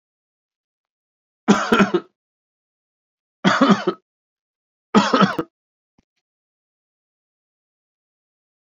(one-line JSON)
{"three_cough_length": "8.8 s", "three_cough_amplitude": 28328, "three_cough_signal_mean_std_ratio": 0.28, "survey_phase": "beta (2021-08-13 to 2022-03-07)", "age": "45-64", "gender": "Male", "wearing_mask": "No", "symptom_none": true, "smoker_status": "Never smoked", "respiratory_condition_asthma": false, "respiratory_condition_other": false, "recruitment_source": "REACT", "submission_delay": "0 days", "covid_test_result": "Negative", "covid_test_method": "RT-qPCR", "influenza_a_test_result": "Negative", "influenza_b_test_result": "Negative"}